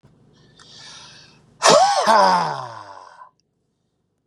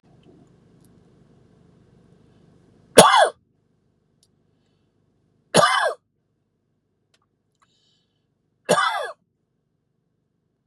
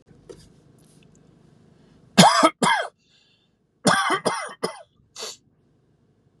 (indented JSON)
{
  "exhalation_length": "4.3 s",
  "exhalation_amplitude": 32397,
  "exhalation_signal_mean_std_ratio": 0.41,
  "three_cough_length": "10.7 s",
  "three_cough_amplitude": 32768,
  "three_cough_signal_mean_std_ratio": 0.23,
  "cough_length": "6.4 s",
  "cough_amplitude": 32767,
  "cough_signal_mean_std_ratio": 0.32,
  "survey_phase": "beta (2021-08-13 to 2022-03-07)",
  "age": "18-44",
  "gender": "Male",
  "wearing_mask": "No",
  "symptom_none": true,
  "smoker_status": "Never smoked",
  "respiratory_condition_asthma": false,
  "respiratory_condition_other": false,
  "recruitment_source": "REACT",
  "submission_delay": "7 days",
  "covid_test_result": "Negative",
  "covid_test_method": "RT-qPCR",
  "influenza_a_test_result": "Negative",
  "influenza_b_test_result": "Negative"
}